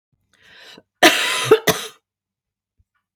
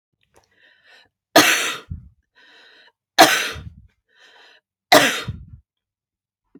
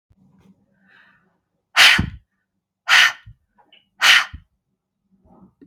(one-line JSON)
{"cough_length": "3.2 s", "cough_amplitude": 32768, "cough_signal_mean_std_ratio": 0.32, "three_cough_length": "6.6 s", "three_cough_amplitude": 32768, "three_cough_signal_mean_std_ratio": 0.29, "exhalation_length": "5.7 s", "exhalation_amplitude": 32768, "exhalation_signal_mean_std_ratio": 0.29, "survey_phase": "beta (2021-08-13 to 2022-03-07)", "age": "45-64", "gender": "Female", "wearing_mask": "No", "symptom_none": true, "smoker_status": "Never smoked", "respiratory_condition_asthma": false, "respiratory_condition_other": false, "recruitment_source": "REACT", "submission_delay": "1 day", "covid_test_result": "Negative", "covid_test_method": "RT-qPCR", "influenza_a_test_result": "Negative", "influenza_b_test_result": "Negative"}